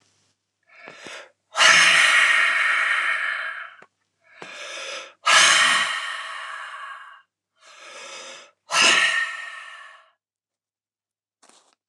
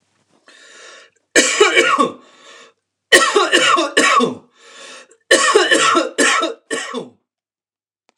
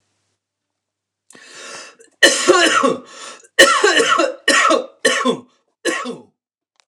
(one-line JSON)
{"exhalation_length": "11.9 s", "exhalation_amplitude": 26108, "exhalation_signal_mean_std_ratio": 0.49, "three_cough_length": "8.2 s", "three_cough_amplitude": 29204, "three_cough_signal_mean_std_ratio": 0.53, "cough_length": "6.9 s", "cough_amplitude": 29204, "cough_signal_mean_std_ratio": 0.48, "survey_phase": "beta (2021-08-13 to 2022-03-07)", "age": "45-64", "gender": "Male", "wearing_mask": "No", "symptom_none": true, "smoker_status": "Current smoker (1 to 10 cigarettes per day)", "respiratory_condition_asthma": false, "respiratory_condition_other": false, "recruitment_source": "REACT", "submission_delay": "2 days", "covid_test_result": "Negative", "covid_test_method": "RT-qPCR", "influenza_a_test_result": "Negative", "influenza_b_test_result": "Negative"}